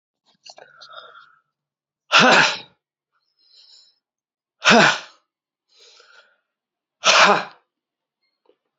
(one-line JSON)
{"exhalation_length": "8.8 s", "exhalation_amplitude": 32547, "exhalation_signal_mean_std_ratio": 0.29, "survey_phase": "alpha (2021-03-01 to 2021-08-12)", "age": "45-64", "gender": "Male", "wearing_mask": "No", "symptom_cough_any": true, "symptom_shortness_of_breath": true, "symptom_fatigue": true, "symptom_headache": true, "symptom_change_to_sense_of_smell_or_taste": true, "symptom_onset": "4 days", "smoker_status": "Never smoked", "respiratory_condition_asthma": false, "respiratory_condition_other": false, "recruitment_source": "Test and Trace", "submission_delay": "1 day", "covid_test_result": "Positive", "covid_test_method": "RT-qPCR", "covid_ct_value": 20.6, "covid_ct_gene": "ORF1ab gene", "covid_ct_mean": 21.1, "covid_viral_load": "120000 copies/ml", "covid_viral_load_category": "Low viral load (10K-1M copies/ml)"}